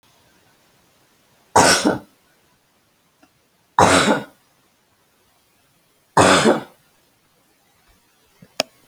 {
  "three_cough_length": "8.9 s",
  "three_cough_amplitude": 32143,
  "three_cough_signal_mean_std_ratio": 0.3,
  "survey_phase": "alpha (2021-03-01 to 2021-08-12)",
  "age": "45-64",
  "gender": "Female",
  "wearing_mask": "No",
  "symptom_none": true,
  "smoker_status": "Ex-smoker",
  "respiratory_condition_asthma": false,
  "respiratory_condition_other": false,
  "recruitment_source": "REACT",
  "submission_delay": "2 days",
  "covid_test_result": "Negative",
  "covid_test_method": "RT-qPCR"
}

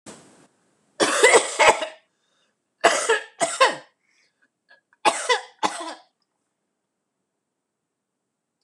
{
  "three_cough_length": "8.6 s",
  "three_cough_amplitude": 26027,
  "three_cough_signal_mean_std_ratio": 0.33,
  "survey_phase": "alpha (2021-03-01 to 2021-08-12)",
  "age": "65+",
  "gender": "Female",
  "wearing_mask": "No",
  "symptom_none": true,
  "smoker_status": "Ex-smoker",
  "respiratory_condition_asthma": true,
  "respiratory_condition_other": false,
  "recruitment_source": "REACT",
  "submission_delay": "1 day",
  "covid_test_result": "Negative",
  "covid_test_method": "RT-qPCR"
}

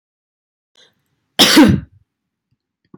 {
  "cough_length": "3.0 s",
  "cough_amplitude": 32768,
  "cough_signal_mean_std_ratio": 0.31,
  "survey_phase": "beta (2021-08-13 to 2022-03-07)",
  "age": "18-44",
  "gender": "Female",
  "wearing_mask": "No",
  "symptom_none": true,
  "symptom_onset": "12 days",
  "smoker_status": "Never smoked",
  "respiratory_condition_asthma": false,
  "respiratory_condition_other": false,
  "recruitment_source": "REACT",
  "submission_delay": "1 day",
  "covid_test_result": "Negative",
  "covid_test_method": "RT-qPCR"
}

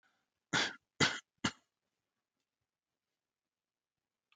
{
  "three_cough_length": "4.4 s",
  "three_cough_amplitude": 5288,
  "three_cough_signal_mean_std_ratio": 0.22,
  "survey_phase": "alpha (2021-03-01 to 2021-08-12)",
  "age": "18-44",
  "gender": "Male",
  "wearing_mask": "No",
  "symptom_none": true,
  "symptom_onset": "7 days",
  "smoker_status": "Never smoked",
  "respiratory_condition_asthma": false,
  "respiratory_condition_other": false,
  "recruitment_source": "REACT",
  "submission_delay": "3 days",
  "covid_test_result": "Negative",
  "covid_test_method": "RT-qPCR"
}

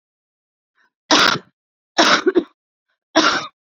{
  "three_cough_length": "3.8 s",
  "three_cough_amplitude": 30417,
  "three_cough_signal_mean_std_ratio": 0.39,
  "survey_phase": "beta (2021-08-13 to 2022-03-07)",
  "age": "18-44",
  "gender": "Female",
  "wearing_mask": "Yes",
  "symptom_none": true,
  "smoker_status": "Current smoker (e-cigarettes or vapes only)",
  "respiratory_condition_asthma": false,
  "respiratory_condition_other": false,
  "recruitment_source": "REACT",
  "submission_delay": "2 days",
  "covid_test_result": "Negative",
  "covid_test_method": "RT-qPCR"
}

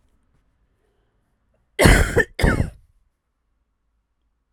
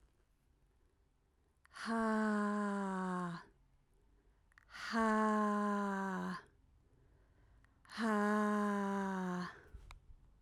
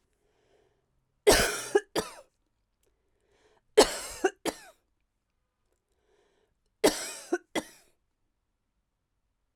{
  "cough_length": "4.5 s",
  "cough_amplitude": 32768,
  "cough_signal_mean_std_ratio": 0.29,
  "exhalation_length": "10.4 s",
  "exhalation_amplitude": 2598,
  "exhalation_signal_mean_std_ratio": 0.59,
  "three_cough_length": "9.6 s",
  "three_cough_amplitude": 18674,
  "three_cough_signal_mean_std_ratio": 0.24,
  "survey_phase": "alpha (2021-03-01 to 2021-08-12)",
  "age": "18-44",
  "gender": "Female",
  "wearing_mask": "No",
  "symptom_fatigue": true,
  "symptom_headache": true,
  "symptom_onset": "9 days",
  "smoker_status": "Never smoked",
  "respiratory_condition_asthma": false,
  "respiratory_condition_other": false,
  "recruitment_source": "REACT",
  "submission_delay": "2 days",
  "covid_test_result": "Negative",
  "covid_test_method": "RT-qPCR"
}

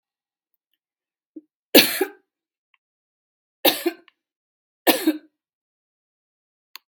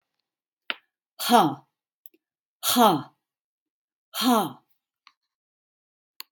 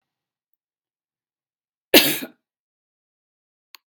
{
  "three_cough_length": "6.9 s",
  "three_cough_amplitude": 32768,
  "three_cough_signal_mean_std_ratio": 0.21,
  "exhalation_length": "6.3 s",
  "exhalation_amplitude": 23326,
  "exhalation_signal_mean_std_ratio": 0.3,
  "cough_length": "3.9 s",
  "cough_amplitude": 32768,
  "cough_signal_mean_std_ratio": 0.17,
  "survey_phase": "beta (2021-08-13 to 2022-03-07)",
  "age": "65+",
  "gender": "Female",
  "wearing_mask": "No",
  "symptom_none": true,
  "smoker_status": "Ex-smoker",
  "respiratory_condition_asthma": false,
  "respiratory_condition_other": false,
  "recruitment_source": "REACT",
  "submission_delay": "1 day",
  "covid_test_result": "Negative",
  "covid_test_method": "RT-qPCR"
}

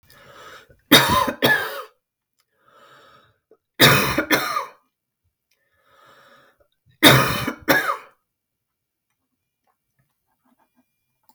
{
  "three_cough_length": "11.3 s",
  "three_cough_amplitude": 32768,
  "three_cough_signal_mean_std_ratio": 0.32,
  "survey_phase": "beta (2021-08-13 to 2022-03-07)",
  "age": "45-64",
  "gender": "Female",
  "wearing_mask": "No",
  "symptom_none": true,
  "smoker_status": "Never smoked",
  "respiratory_condition_asthma": false,
  "respiratory_condition_other": false,
  "recruitment_source": "REACT",
  "submission_delay": "1 day",
  "covid_test_result": "Negative",
  "covid_test_method": "RT-qPCR",
  "influenza_a_test_result": "Negative",
  "influenza_b_test_result": "Negative"
}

